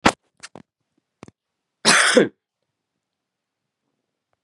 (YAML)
cough_length: 4.4 s
cough_amplitude: 32767
cough_signal_mean_std_ratio: 0.25
survey_phase: beta (2021-08-13 to 2022-03-07)
age: 45-64
gender: Female
wearing_mask: 'No'
symptom_cough_any: true
symptom_runny_or_blocked_nose: true
symptom_sore_throat: true
symptom_fever_high_temperature: true
symptom_headache: true
symptom_other: true
symptom_onset: 4 days
smoker_status: Current smoker (1 to 10 cigarettes per day)
respiratory_condition_asthma: false
respiratory_condition_other: false
recruitment_source: Test and Trace
submission_delay: 1 day
covid_test_result: Positive
covid_test_method: RT-qPCR
covid_ct_value: 21.8
covid_ct_gene: ORF1ab gene
covid_ct_mean: 22.5
covid_viral_load: 43000 copies/ml
covid_viral_load_category: Low viral load (10K-1M copies/ml)